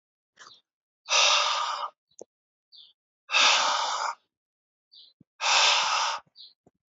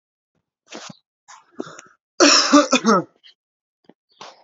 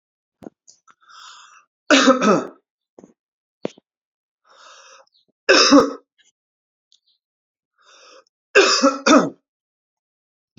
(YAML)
exhalation_length: 6.9 s
exhalation_amplitude: 14803
exhalation_signal_mean_std_ratio: 0.48
cough_length: 4.4 s
cough_amplitude: 30653
cough_signal_mean_std_ratio: 0.33
three_cough_length: 10.6 s
three_cough_amplitude: 32210
three_cough_signal_mean_std_ratio: 0.3
survey_phase: alpha (2021-03-01 to 2021-08-12)
age: 18-44
gender: Male
wearing_mask: 'No'
symptom_none: true
smoker_status: Current smoker (e-cigarettes or vapes only)
respiratory_condition_asthma: false
respiratory_condition_other: false
recruitment_source: REACT
submission_delay: 9 days
covid_test_result: Negative
covid_test_method: RT-qPCR